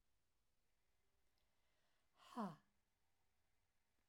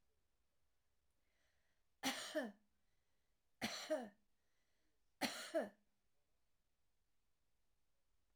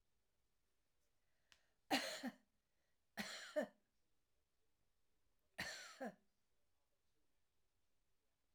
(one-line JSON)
{"exhalation_length": "4.1 s", "exhalation_amplitude": 399, "exhalation_signal_mean_std_ratio": 0.25, "three_cough_length": "8.4 s", "three_cough_amplitude": 1386, "three_cough_signal_mean_std_ratio": 0.31, "cough_length": "8.5 s", "cough_amplitude": 2126, "cough_signal_mean_std_ratio": 0.29, "survey_phase": "alpha (2021-03-01 to 2021-08-12)", "age": "65+", "gender": "Female", "wearing_mask": "No", "symptom_cough_any": true, "symptom_fatigue": true, "smoker_status": "Never smoked", "respiratory_condition_asthma": true, "respiratory_condition_other": true, "recruitment_source": "REACT", "submission_delay": "2 days", "covid_test_result": "Negative", "covid_test_method": "RT-qPCR"}